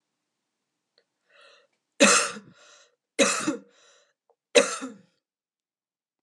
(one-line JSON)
{"three_cough_length": "6.2 s", "three_cough_amplitude": 22407, "three_cough_signal_mean_std_ratio": 0.27, "survey_phase": "beta (2021-08-13 to 2022-03-07)", "age": "18-44", "gender": "Female", "wearing_mask": "No", "symptom_cough_any": true, "symptom_runny_or_blocked_nose": true, "symptom_sore_throat": true, "symptom_abdominal_pain": true, "symptom_fatigue": true, "symptom_headache": true, "symptom_onset": "8 days", "smoker_status": "Ex-smoker", "respiratory_condition_asthma": false, "respiratory_condition_other": false, "recruitment_source": "REACT", "submission_delay": "2 days", "covid_test_result": "Negative", "covid_test_method": "RT-qPCR", "influenza_a_test_result": "Unknown/Void", "influenza_b_test_result": "Unknown/Void"}